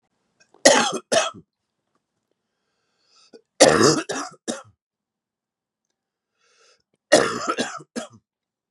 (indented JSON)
{
  "three_cough_length": "8.7 s",
  "three_cough_amplitude": 32767,
  "three_cough_signal_mean_std_ratio": 0.3,
  "survey_phase": "beta (2021-08-13 to 2022-03-07)",
  "age": "45-64",
  "gender": "Male",
  "wearing_mask": "No",
  "symptom_cough_any": true,
  "symptom_runny_or_blocked_nose": true,
  "symptom_shortness_of_breath": true,
  "symptom_sore_throat": true,
  "symptom_fatigue": true,
  "symptom_fever_high_temperature": true,
  "symptom_headache": true,
  "symptom_change_to_sense_of_smell_or_taste": true,
  "symptom_loss_of_taste": true,
  "symptom_other": true,
  "symptom_onset": "4 days",
  "smoker_status": "Never smoked",
  "respiratory_condition_asthma": false,
  "respiratory_condition_other": false,
  "recruitment_source": "Test and Trace",
  "submission_delay": "3 days",
  "covid_test_result": "Positive",
  "covid_test_method": "RT-qPCR",
  "covid_ct_value": 16.5,
  "covid_ct_gene": "ORF1ab gene",
  "covid_ct_mean": 16.9,
  "covid_viral_load": "2900000 copies/ml",
  "covid_viral_load_category": "High viral load (>1M copies/ml)"
}